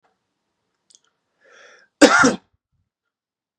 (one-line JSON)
{"cough_length": "3.6 s", "cough_amplitude": 32768, "cough_signal_mean_std_ratio": 0.23, "survey_phase": "beta (2021-08-13 to 2022-03-07)", "age": "18-44", "gender": "Male", "wearing_mask": "No", "symptom_none": true, "smoker_status": "Never smoked", "respiratory_condition_asthma": false, "respiratory_condition_other": false, "recruitment_source": "REACT", "submission_delay": "4 days", "covid_test_result": "Negative", "covid_test_method": "RT-qPCR", "influenza_a_test_result": "Negative", "influenza_b_test_result": "Negative"}